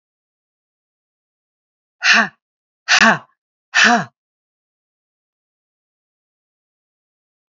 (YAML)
exhalation_length: 7.5 s
exhalation_amplitude: 30816
exhalation_signal_mean_std_ratio: 0.25
survey_phase: alpha (2021-03-01 to 2021-08-12)
age: 45-64
gender: Female
wearing_mask: 'No'
symptom_none: true
smoker_status: Never smoked
respiratory_condition_asthma: true
respiratory_condition_other: false
recruitment_source: REACT
submission_delay: 2 days
covid_test_result: Negative
covid_test_method: RT-qPCR